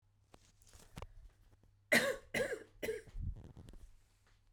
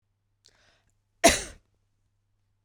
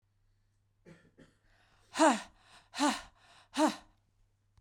{
  "three_cough_length": "4.5 s",
  "three_cough_amplitude": 5728,
  "three_cough_signal_mean_std_ratio": 0.38,
  "cough_length": "2.6 s",
  "cough_amplitude": 21529,
  "cough_signal_mean_std_ratio": 0.18,
  "exhalation_length": "4.6 s",
  "exhalation_amplitude": 6741,
  "exhalation_signal_mean_std_ratio": 0.3,
  "survey_phase": "beta (2021-08-13 to 2022-03-07)",
  "age": "45-64",
  "gender": "Female",
  "wearing_mask": "No",
  "symptom_cough_any": true,
  "symptom_runny_or_blocked_nose": true,
  "symptom_sore_throat": true,
  "symptom_fever_high_temperature": true,
  "symptom_change_to_sense_of_smell_or_taste": true,
  "symptom_onset": "6 days",
  "smoker_status": "Never smoked",
  "respiratory_condition_asthma": false,
  "respiratory_condition_other": false,
  "recruitment_source": "Test and Trace",
  "submission_delay": "1 day",
  "covid_test_result": "Positive",
  "covid_test_method": "RT-qPCR",
  "covid_ct_value": 19.5,
  "covid_ct_gene": "ORF1ab gene",
  "covid_ct_mean": 20.6,
  "covid_viral_load": "180000 copies/ml",
  "covid_viral_load_category": "Low viral load (10K-1M copies/ml)"
}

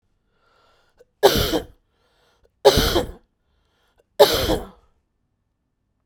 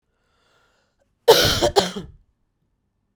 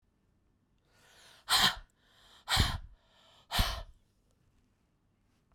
{
  "three_cough_length": "6.1 s",
  "three_cough_amplitude": 32767,
  "three_cough_signal_mean_std_ratio": 0.31,
  "cough_length": "3.2 s",
  "cough_amplitude": 32767,
  "cough_signal_mean_std_ratio": 0.31,
  "exhalation_length": "5.5 s",
  "exhalation_amplitude": 9088,
  "exhalation_signal_mean_std_ratio": 0.31,
  "survey_phase": "beta (2021-08-13 to 2022-03-07)",
  "age": "18-44",
  "gender": "Female",
  "wearing_mask": "No",
  "symptom_cough_any": true,
  "symptom_headache": true,
  "symptom_onset": "7 days",
  "smoker_status": "Ex-smoker",
  "respiratory_condition_asthma": false,
  "respiratory_condition_other": false,
  "recruitment_source": "REACT",
  "submission_delay": "0 days",
  "covid_test_result": "Negative",
  "covid_test_method": "RT-qPCR"
}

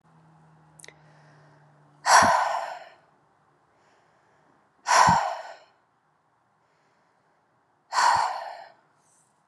{
  "exhalation_length": "9.5 s",
  "exhalation_amplitude": 23104,
  "exhalation_signal_mean_std_ratio": 0.33,
  "survey_phase": "beta (2021-08-13 to 2022-03-07)",
  "age": "45-64",
  "gender": "Female",
  "wearing_mask": "No",
  "symptom_cough_any": true,
  "symptom_runny_or_blocked_nose": true,
  "symptom_sore_throat": true,
  "symptom_fatigue": true,
  "symptom_headache": true,
  "symptom_change_to_sense_of_smell_or_taste": true,
  "symptom_onset": "4 days",
  "smoker_status": "Never smoked",
  "respiratory_condition_asthma": false,
  "respiratory_condition_other": false,
  "recruitment_source": "Test and Trace",
  "submission_delay": "2 days",
  "covid_test_result": "Positive",
  "covid_test_method": "RT-qPCR",
  "covid_ct_value": 22.2,
  "covid_ct_gene": "ORF1ab gene"
}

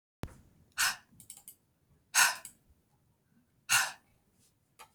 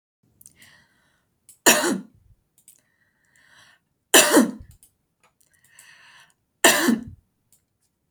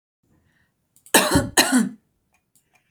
{
  "exhalation_length": "4.9 s",
  "exhalation_amplitude": 11178,
  "exhalation_signal_mean_std_ratio": 0.28,
  "three_cough_length": "8.1 s",
  "three_cough_amplitude": 32767,
  "three_cough_signal_mean_std_ratio": 0.27,
  "cough_length": "2.9 s",
  "cough_amplitude": 32767,
  "cough_signal_mean_std_ratio": 0.36,
  "survey_phase": "beta (2021-08-13 to 2022-03-07)",
  "age": "18-44",
  "gender": "Female",
  "wearing_mask": "No",
  "symptom_none": true,
  "smoker_status": "Never smoked",
  "respiratory_condition_asthma": false,
  "respiratory_condition_other": false,
  "recruitment_source": "REACT",
  "submission_delay": "2 days",
  "covid_test_result": "Negative",
  "covid_test_method": "RT-qPCR",
  "influenza_a_test_result": "Negative",
  "influenza_b_test_result": "Negative"
}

